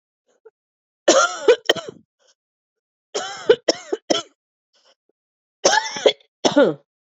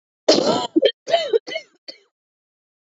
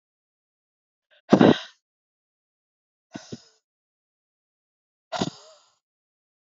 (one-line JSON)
{"three_cough_length": "7.2 s", "three_cough_amplitude": 32346, "three_cough_signal_mean_std_ratio": 0.33, "cough_length": "2.9 s", "cough_amplitude": 27414, "cough_signal_mean_std_ratio": 0.41, "exhalation_length": "6.6 s", "exhalation_amplitude": 27725, "exhalation_signal_mean_std_ratio": 0.16, "survey_phase": "beta (2021-08-13 to 2022-03-07)", "age": "18-44", "gender": "Female", "wearing_mask": "No", "symptom_cough_any": true, "symptom_runny_or_blocked_nose": true, "symptom_sore_throat": true, "symptom_fatigue": true, "symptom_headache": true, "symptom_other": true, "symptom_onset": "3 days", "smoker_status": "Never smoked", "respiratory_condition_asthma": false, "respiratory_condition_other": false, "recruitment_source": "Test and Trace", "submission_delay": "0 days", "covid_test_result": "Positive", "covid_test_method": "RT-qPCR", "covid_ct_value": 15.5, "covid_ct_gene": "ORF1ab gene", "covid_ct_mean": 15.8, "covid_viral_load": "6800000 copies/ml", "covid_viral_load_category": "High viral load (>1M copies/ml)"}